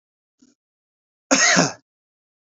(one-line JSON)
{"cough_length": "2.5 s", "cough_amplitude": 27962, "cough_signal_mean_std_ratio": 0.32, "survey_phase": "beta (2021-08-13 to 2022-03-07)", "age": "45-64", "gender": "Male", "wearing_mask": "No", "symptom_none": true, "smoker_status": "Current smoker (e-cigarettes or vapes only)", "respiratory_condition_asthma": false, "respiratory_condition_other": false, "recruitment_source": "REACT", "submission_delay": "2 days", "covid_test_result": "Negative", "covid_test_method": "RT-qPCR", "influenza_a_test_result": "Unknown/Void", "influenza_b_test_result": "Unknown/Void"}